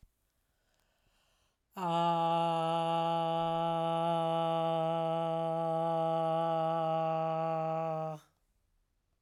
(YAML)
exhalation_length: 9.2 s
exhalation_amplitude: 2971
exhalation_signal_mean_std_ratio: 0.9
survey_phase: alpha (2021-03-01 to 2021-08-12)
age: 45-64
gender: Female
wearing_mask: 'No'
symptom_headache: true
symptom_change_to_sense_of_smell_or_taste: true
symptom_onset: 5 days
smoker_status: Never smoked
respiratory_condition_asthma: false
respiratory_condition_other: false
recruitment_source: Test and Trace
submission_delay: 2 days
covid_test_result: Positive
covid_test_method: RT-qPCR
covid_ct_value: 15.6
covid_ct_gene: ORF1ab gene
covid_ct_mean: 16.1
covid_viral_load: 5000000 copies/ml
covid_viral_load_category: High viral load (>1M copies/ml)